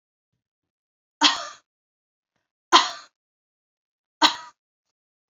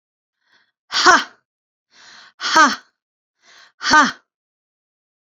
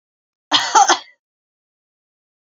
{"three_cough_length": "5.3 s", "three_cough_amplitude": 27454, "three_cough_signal_mean_std_ratio": 0.21, "exhalation_length": "5.3 s", "exhalation_amplitude": 32767, "exhalation_signal_mean_std_ratio": 0.3, "cough_length": "2.6 s", "cough_amplitude": 30497, "cough_signal_mean_std_ratio": 0.3, "survey_phase": "beta (2021-08-13 to 2022-03-07)", "age": "45-64", "gender": "Female", "wearing_mask": "No", "symptom_none": true, "smoker_status": "Never smoked", "respiratory_condition_asthma": false, "respiratory_condition_other": false, "recruitment_source": "REACT", "submission_delay": "0 days", "covid_test_result": "Negative", "covid_test_method": "RT-qPCR"}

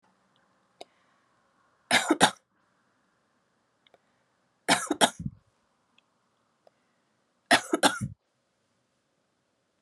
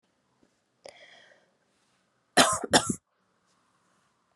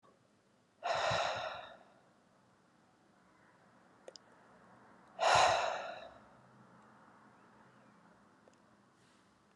{"three_cough_length": "9.8 s", "three_cough_amplitude": 22670, "three_cough_signal_mean_std_ratio": 0.23, "cough_length": "4.4 s", "cough_amplitude": 23378, "cough_signal_mean_std_ratio": 0.22, "exhalation_length": "9.6 s", "exhalation_amplitude": 5709, "exhalation_signal_mean_std_ratio": 0.33, "survey_phase": "beta (2021-08-13 to 2022-03-07)", "age": "18-44", "gender": "Female", "wearing_mask": "No", "symptom_runny_or_blocked_nose": true, "symptom_abdominal_pain": true, "symptom_diarrhoea": true, "symptom_fatigue": true, "symptom_fever_high_temperature": true, "symptom_headache": true, "symptom_change_to_sense_of_smell_or_taste": true, "smoker_status": "Never smoked", "respiratory_condition_asthma": false, "respiratory_condition_other": false, "recruitment_source": "Test and Trace", "submission_delay": "1 day", "covid_test_result": "Positive", "covid_test_method": "RT-qPCR", "covid_ct_value": 34.0, "covid_ct_gene": "N gene"}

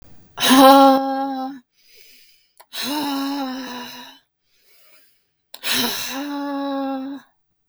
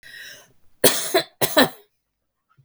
{"exhalation_length": "7.7 s", "exhalation_amplitude": 32768, "exhalation_signal_mean_std_ratio": 0.45, "three_cough_length": "2.6 s", "three_cough_amplitude": 32766, "three_cough_signal_mean_std_ratio": 0.35, "survey_phase": "beta (2021-08-13 to 2022-03-07)", "age": "45-64", "gender": "Female", "wearing_mask": "No", "symptom_none": true, "symptom_onset": "2 days", "smoker_status": "Never smoked", "respiratory_condition_asthma": false, "respiratory_condition_other": false, "recruitment_source": "REACT", "submission_delay": "2 days", "covid_test_result": "Negative", "covid_test_method": "RT-qPCR", "influenza_a_test_result": "Negative", "influenza_b_test_result": "Negative"}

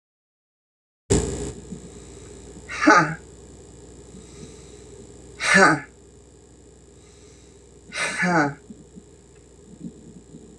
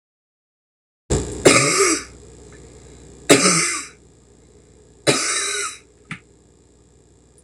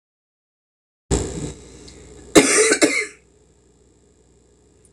{"exhalation_length": "10.6 s", "exhalation_amplitude": 25596, "exhalation_signal_mean_std_ratio": 0.36, "three_cough_length": "7.4 s", "three_cough_amplitude": 26028, "three_cough_signal_mean_std_ratio": 0.4, "cough_length": "4.9 s", "cough_amplitude": 26028, "cough_signal_mean_std_ratio": 0.34, "survey_phase": "beta (2021-08-13 to 2022-03-07)", "age": "45-64", "gender": "Female", "wearing_mask": "No", "symptom_cough_any": true, "symptom_runny_or_blocked_nose": true, "symptom_fatigue": true, "symptom_headache": true, "symptom_change_to_sense_of_smell_or_taste": true, "symptom_loss_of_taste": true, "symptom_onset": "5 days", "smoker_status": "Ex-smoker", "respiratory_condition_asthma": true, "respiratory_condition_other": false, "recruitment_source": "Test and Trace", "submission_delay": "2 days", "covid_test_result": "Positive", "covid_test_method": "RT-qPCR", "covid_ct_value": 14.9, "covid_ct_gene": "ORF1ab gene", "covid_ct_mean": 15.3, "covid_viral_load": "9600000 copies/ml", "covid_viral_load_category": "High viral load (>1M copies/ml)"}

